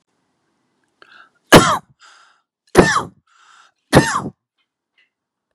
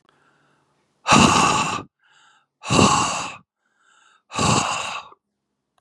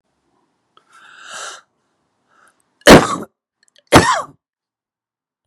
{"three_cough_length": "5.5 s", "three_cough_amplitude": 32768, "three_cough_signal_mean_std_ratio": 0.27, "exhalation_length": "5.8 s", "exhalation_amplitude": 30039, "exhalation_signal_mean_std_ratio": 0.45, "cough_length": "5.5 s", "cough_amplitude": 32768, "cough_signal_mean_std_ratio": 0.24, "survey_phase": "beta (2021-08-13 to 2022-03-07)", "age": "45-64", "gender": "Male", "wearing_mask": "Yes", "symptom_none": true, "smoker_status": "Ex-smoker", "respiratory_condition_asthma": false, "respiratory_condition_other": false, "recruitment_source": "REACT", "submission_delay": "3 days", "covid_test_result": "Negative", "covid_test_method": "RT-qPCR", "influenza_a_test_result": "Negative", "influenza_b_test_result": "Negative"}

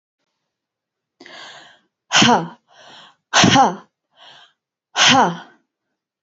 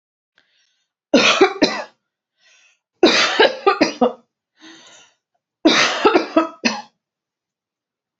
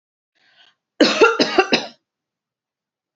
{"exhalation_length": "6.2 s", "exhalation_amplitude": 30048, "exhalation_signal_mean_std_ratio": 0.35, "three_cough_length": "8.2 s", "three_cough_amplitude": 29533, "three_cough_signal_mean_std_ratio": 0.4, "cough_length": "3.2 s", "cough_amplitude": 28530, "cough_signal_mean_std_ratio": 0.35, "survey_phase": "beta (2021-08-13 to 2022-03-07)", "age": "18-44", "gender": "Female", "wearing_mask": "No", "symptom_sore_throat": true, "smoker_status": "Never smoked", "respiratory_condition_asthma": false, "respiratory_condition_other": false, "recruitment_source": "Test and Trace", "submission_delay": "1 day", "covid_test_result": "Negative", "covid_test_method": "RT-qPCR"}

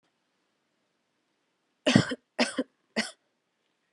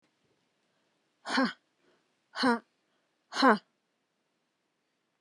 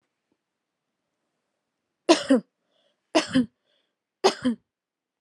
{"cough_length": "3.9 s", "cough_amplitude": 23007, "cough_signal_mean_std_ratio": 0.24, "exhalation_length": "5.2 s", "exhalation_amplitude": 13266, "exhalation_signal_mean_std_ratio": 0.25, "three_cough_length": "5.2 s", "three_cough_amplitude": 23093, "three_cough_signal_mean_std_ratio": 0.26, "survey_phase": "alpha (2021-03-01 to 2021-08-12)", "age": "18-44", "gender": "Female", "wearing_mask": "No", "symptom_none": true, "smoker_status": "Ex-smoker", "respiratory_condition_asthma": false, "respiratory_condition_other": false, "recruitment_source": "REACT", "submission_delay": "2 days", "covid_test_result": "Negative", "covid_test_method": "RT-qPCR"}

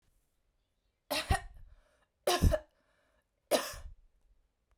{"three_cough_length": "4.8 s", "three_cough_amplitude": 6378, "three_cough_signal_mean_std_ratio": 0.31, "survey_phase": "beta (2021-08-13 to 2022-03-07)", "age": "18-44", "gender": "Female", "wearing_mask": "No", "symptom_none": true, "smoker_status": "Ex-smoker", "respiratory_condition_asthma": false, "respiratory_condition_other": false, "recruitment_source": "REACT", "submission_delay": "1 day", "covid_test_result": "Negative", "covid_test_method": "RT-qPCR", "influenza_a_test_result": "Negative", "influenza_b_test_result": "Negative"}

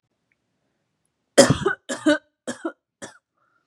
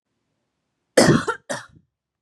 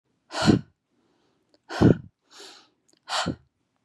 {"three_cough_length": "3.7 s", "three_cough_amplitude": 32767, "three_cough_signal_mean_std_ratio": 0.27, "cough_length": "2.2 s", "cough_amplitude": 31234, "cough_signal_mean_std_ratio": 0.31, "exhalation_length": "3.8 s", "exhalation_amplitude": 23419, "exhalation_signal_mean_std_ratio": 0.3, "survey_phase": "beta (2021-08-13 to 2022-03-07)", "age": "18-44", "gender": "Female", "wearing_mask": "No", "symptom_runny_or_blocked_nose": true, "symptom_fatigue": true, "smoker_status": "Never smoked", "respiratory_condition_asthma": false, "respiratory_condition_other": false, "recruitment_source": "REACT", "submission_delay": "4 days", "covid_test_result": "Negative", "covid_test_method": "RT-qPCR", "covid_ct_value": 37.5, "covid_ct_gene": "N gene", "influenza_a_test_result": "Negative", "influenza_b_test_result": "Negative"}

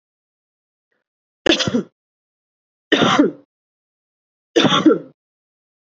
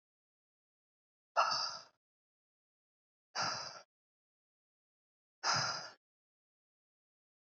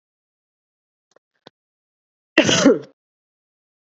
{"three_cough_length": "5.8 s", "three_cough_amplitude": 28400, "three_cough_signal_mean_std_ratio": 0.34, "exhalation_length": "7.5 s", "exhalation_amplitude": 4568, "exhalation_signal_mean_std_ratio": 0.29, "cough_length": "3.8 s", "cough_amplitude": 32768, "cough_signal_mean_std_ratio": 0.24, "survey_phase": "beta (2021-08-13 to 2022-03-07)", "age": "18-44", "gender": "Female", "wearing_mask": "No", "symptom_cough_any": true, "symptom_new_continuous_cough": true, "symptom_runny_or_blocked_nose": true, "symptom_sore_throat": true, "symptom_other": true, "symptom_onset": "7 days", "smoker_status": "Never smoked", "respiratory_condition_asthma": false, "respiratory_condition_other": false, "recruitment_source": "Test and Trace", "submission_delay": "2 days", "covid_test_result": "Positive", "covid_test_method": "RT-qPCR", "covid_ct_value": 25.5, "covid_ct_gene": "N gene", "covid_ct_mean": 25.6, "covid_viral_load": "4000 copies/ml", "covid_viral_load_category": "Minimal viral load (< 10K copies/ml)"}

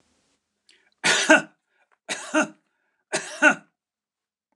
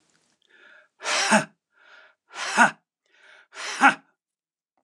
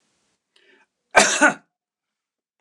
{"three_cough_length": "4.6 s", "three_cough_amplitude": 29203, "three_cough_signal_mean_std_ratio": 0.31, "exhalation_length": "4.8 s", "exhalation_amplitude": 26468, "exhalation_signal_mean_std_ratio": 0.31, "cough_length": "2.6 s", "cough_amplitude": 29203, "cough_signal_mean_std_ratio": 0.27, "survey_phase": "beta (2021-08-13 to 2022-03-07)", "age": "65+", "gender": "Male", "wearing_mask": "No", "symptom_none": true, "smoker_status": "Ex-smoker", "respiratory_condition_asthma": false, "respiratory_condition_other": false, "recruitment_source": "REACT", "submission_delay": "2 days", "covid_test_result": "Negative", "covid_test_method": "RT-qPCR"}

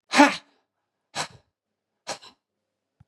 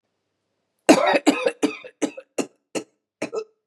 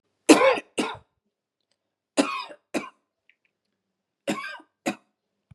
{"exhalation_length": "3.1 s", "exhalation_amplitude": 28703, "exhalation_signal_mean_std_ratio": 0.22, "cough_length": "3.7 s", "cough_amplitude": 32768, "cough_signal_mean_std_ratio": 0.36, "three_cough_length": "5.5 s", "three_cough_amplitude": 29141, "three_cough_signal_mean_std_ratio": 0.27, "survey_phase": "beta (2021-08-13 to 2022-03-07)", "age": "45-64", "gender": "Female", "wearing_mask": "No", "symptom_runny_or_blocked_nose": true, "symptom_fatigue": true, "symptom_headache": true, "smoker_status": "Never smoked", "respiratory_condition_asthma": false, "respiratory_condition_other": false, "recruitment_source": "REACT", "submission_delay": "1 day", "covid_test_result": "Negative", "covid_test_method": "RT-qPCR", "influenza_a_test_result": "Negative", "influenza_b_test_result": "Negative"}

